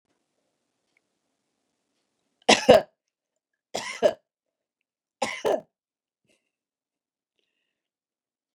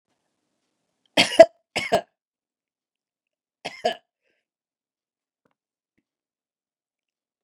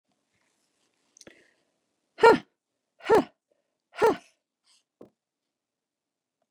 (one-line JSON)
{"three_cough_length": "8.5 s", "three_cough_amplitude": 27814, "three_cough_signal_mean_std_ratio": 0.18, "cough_length": "7.4 s", "cough_amplitude": 32768, "cough_signal_mean_std_ratio": 0.14, "exhalation_length": "6.5 s", "exhalation_amplitude": 17022, "exhalation_signal_mean_std_ratio": 0.2, "survey_phase": "beta (2021-08-13 to 2022-03-07)", "age": "65+", "gender": "Female", "wearing_mask": "No", "symptom_none": true, "smoker_status": "Never smoked", "respiratory_condition_asthma": false, "respiratory_condition_other": false, "recruitment_source": "REACT", "submission_delay": "2 days", "covid_test_result": "Negative", "covid_test_method": "RT-qPCR", "influenza_a_test_result": "Negative", "influenza_b_test_result": "Negative"}